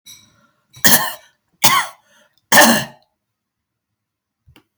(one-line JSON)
{"cough_length": "4.8 s", "cough_amplitude": 32768, "cough_signal_mean_std_ratio": 0.32, "survey_phase": "beta (2021-08-13 to 2022-03-07)", "age": "65+", "gender": "Female", "wearing_mask": "No", "symptom_none": true, "smoker_status": "Ex-smoker", "respiratory_condition_asthma": true, "respiratory_condition_other": false, "recruitment_source": "REACT", "submission_delay": "3 days", "covid_test_result": "Negative", "covid_test_method": "RT-qPCR", "influenza_a_test_result": "Negative", "influenza_b_test_result": "Negative"}